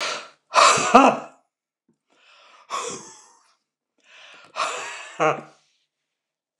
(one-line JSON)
{"exhalation_length": "6.6 s", "exhalation_amplitude": 29204, "exhalation_signal_mean_std_ratio": 0.32, "survey_phase": "beta (2021-08-13 to 2022-03-07)", "age": "65+", "gender": "Male", "wearing_mask": "No", "symptom_none": true, "smoker_status": "Never smoked", "respiratory_condition_asthma": false, "respiratory_condition_other": false, "recruitment_source": "REACT", "submission_delay": "1 day", "covid_test_result": "Negative", "covid_test_method": "RT-qPCR", "influenza_a_test_result": "Negative", "influenza_b_test_result": "Negative"}